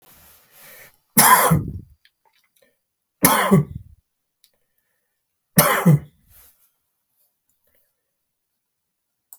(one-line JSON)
{"three_cough_length": "9.4 s", "three_cough_amplitude": 32768, "three_cough_signal_mean_std_ratio": 0.3, "survey_phase": "beta (2021-08-13 to 2022-03-07)", "age": "65+", "gender": "Male", "wearing_mask": "No", "symptom_none": true, "symptom_onset": "12 days", "smoker_status": "Ex-smoker", "respiratory_condition_asthma": false, "respiratory_condition_other": false, "recruitment_source": "REACT", "submission_delay": "1 day", "covid_test_result": "Negative", "covid_test_method": "RT-qPCR"}